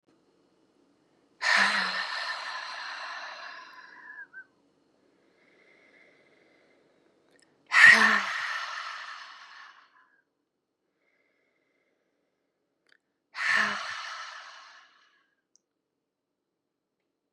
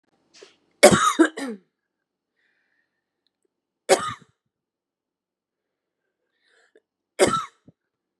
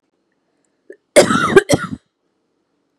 {"exhalation_length": "17.3 s", "exhalation_amplitude": 24014, "exhalation_signal_mean_std_ratio": 0.29, "three_cough_length": "8.2 s", "three_cough_amplitude": 32768, "three_cough_signal_mean_std_ratio": 0.23, "cough_length": "3.0 s", "cough_amplitude": 32768, "cough_signal_mean_std_ratio": 0.31, "survey_phase": "beta (2021-08-13 to 2022-03-07)", "age": "45-64", "gender": "Female", "wearing_mask": "No", "symptom_cough_any": true, "symptom_runny_or_blocked_nose": true, "symptom_shortness_of_breath": true, "symptom_fatigue": true, "symptom_onset": "4 days", "smoker_status": "Current smoker (e-cigarettes or vapes only)", "respiratory_condition_asthma": true, "respiratory_condition_other": false, "recruitment_source": "Test and Trace", "submission_delay": "2 days", "covid_test_result": "Positive", "covid_test_method": "RT-qPCR", "covid_ct_value": 21.2, "covid_ct_gene": "N gene"}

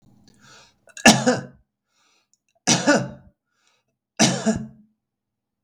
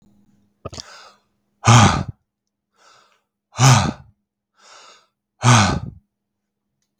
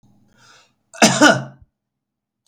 {"three_cough_length": "5.6 s", "three_cough_amplitude": 32767, "three_cough_signal_mean_std_ratio": 0.32, "exhalation_length": "7.0 s", "exhalation_amplitude": 32766, "exhalation_signal_mean_std_ratio": 0.32, "cough_length": "2.5 s", "cough_amplitude": 32768, "cough_signal_mean_std_ratio": 0.3, "survey_phase": "beta (2021-08-13 to 2022-03-07)", "age": "45-64", "gender": "Male", "wearing_mask": "No", "symptom_none": true, "smoker_status": "Never smoked", "respiratory_condition_asthma": false, "respiratory_condition_other": false, "recruitment_source": "REACT", "submission_delay": "3 days", "covid_test_result": "Negative", "covid_test_method": "RT-qPCR", "influenza_a_test_result": "Negative", "influenza_b_test_result": "Negative"}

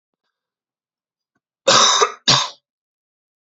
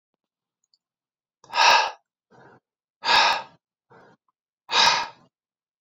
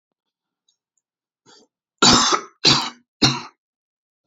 {"cough_length": "3.4 s", "cough_amplitude": 32768, "cough_signal_mean_std_ratio": 0.34, "exhalation_length": "5.8 s", "exhalation_amplitude": 20016, "exhalation_signal_mean_std_ratio": 0.34, "three_cough_length": "4.3 s", "three_cough_amplitude": 32767, "three_cough_signal_mean_std_ratio": 0.33, "survey_phase": "beta (2021-08-13 to 2022-03-07)", "age": "18-44", "gender": "Male", "wearing_mask": "No", "symptom_cough_any": true, "symptom_new_continuous_cough": true, "symptom_runny_or_blocked_nose": true, "symptom_onset": "4 days", "smoker_status": "Never smoked", "respiratory_condition_asthma": false, "respiratory_condition_other": false, "recruitment_source": "REACT", "submission_delay": "5 days", "covid_test_result": "Negative", "covid_test_method": "RT-qPCR"}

